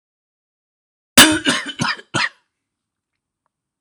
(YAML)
cough_length: 3.8 s
cough_amplitude: 26028
cough_signal_mean_std_ratio: 0.29
survey_phase: alpha (2021-03-01 to 2021-08-12)
age: 45-64
gender: Male
wearing_mask: 'No'
symptom_none: true
smoker_status: Ex-smoker
respiratory_condition_asthma: false
respiratory_condition_other: false
recruitment_source: REACT
submission_delay: 2 days
covid_test_result: Negative
covid_test_method: RT-qPCR